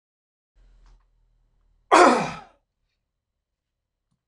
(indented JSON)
{
  "cough_length": "4.3 s",
  "cough_amplitude": 26028,
  "cough_signal_mean_std_ratio": 0.22,
  "survey_phase": "beta (2021-08-13 to 2022-03-07)",
  "age": "65+",
  "gender": "Male",
  "wearing_mask": "No",
  "symptom_none": true,
  "smoker_status": "Never smoked",
  "respiratory_condition_asthma": false,
  "respiratory_condition_other": false,
  "recruitment_source": "REACT",
  "submission_delay": "0 days",
  "covid_test_result": "Negative",
  "covid_test_method": "RT-qPCR"
}